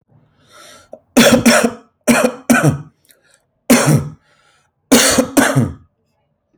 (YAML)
three_cough_length: 6.6 s
three_cough_amplitude: 32768
three_cough_signal_mean_std_ratio: 0.48
survey_phase: alpha (2021-03-01 to 2021-08-12)
age: 18-44
gender: Male
wearing_mask: 'No'
symptom_none: true
smoker_status: Ex-smoker
respiratory_condition_asthma: false
respiratory_condition_other: false
recruitment_source: REACT
submission_delay: 2 days
covid_test_result: Negative
covid_test_method: RT-qPCR